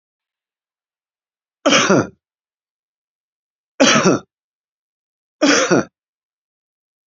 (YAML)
three_cough_length: 7.1 s
three_cough_amplitude: 30660
three_cough_signal_mean_std_ratio: 0.32
survey_phase: beta (2021-08-13 to 2022-03-07)
age: 65+
gender: Male
wearing_mask: 'No'
symptom_none: true
symptom_onset: 12 days
smoker_status: Never smoked
respiratory_condition_asthma: false
respiratory_condition_other: true
recruitment_source: REACT
submission_delay: 4 days
covid_test_result: Negative
covid_test_method: RT-qPCR
influenza_a_test_result: Negative
influenza_b_test_result: Negative